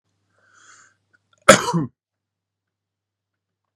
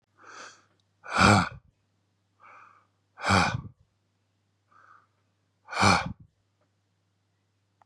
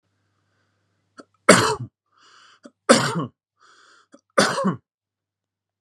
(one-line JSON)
{"cough_length": "3.8 s", "cough_amplitude": 32768, "cough_signal_mean_std_ratio": 0.18, "exhalation_length": "7.9 s", "exhalation_amplitude": 17937, "exhalation_signal_mean_std_ratio": 0.29, "three_cough_length": "5.8 s", "three_cough_amplitude": 32768, "three_cough_signal_mean_std_ratio": 0.29, "survey_phase": "beta (2021-08-13 to 2022-03-07)", "age": "18-44", "gender": "Male", "wearing_mask": "No", "symptom_none": true, "smoker_status": "Ex-smoker", "respiratory_condition_asthma": false, "respiratory_condition_other": false, "recruitment_source": "REACT", "submission_delay": "4 days", "covid_test_result": "Negative", "covid_test_method": "RT-qPCR", "influenza_a_test_result": "Negative", "influenza_b_test_result": "Negative"}